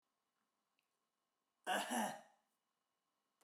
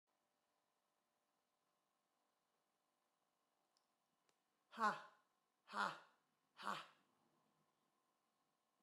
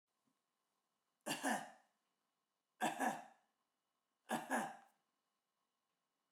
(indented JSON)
{
  "cough_length": "3.4 s",
  "cough_amplitude": 1523,
  "cough_signal_mean_std_ratio": 0.31,
  "exhalation_length": "8.8 s",
  "exhalation_amplitude": 1325,
  "exhalation_signal_mean_std_ratio": 0.2,
  "three_cough_length": "6.3 s",
  "three_cough_amplitude": 1736,
  "three_cough_signal_mean_std_ratio": 0.33,
  "survey_phase": "beta (2021-08-13 to 2022-03-07)",
  "age": "45-64",
  "gender": "Female",
  "wearing_mask": "No",
  "symptom_none": true,
  "smoker_status": "Never smoked",
  "respiratory_condition_asthma": false,
  "respiratory_condition_other": false,
  "recruitment_source": "REACT",
  "submission_delay": "2 days",
  "covid_test_result": "Negative",
  "covid_test_method": "RT-qPCR"
}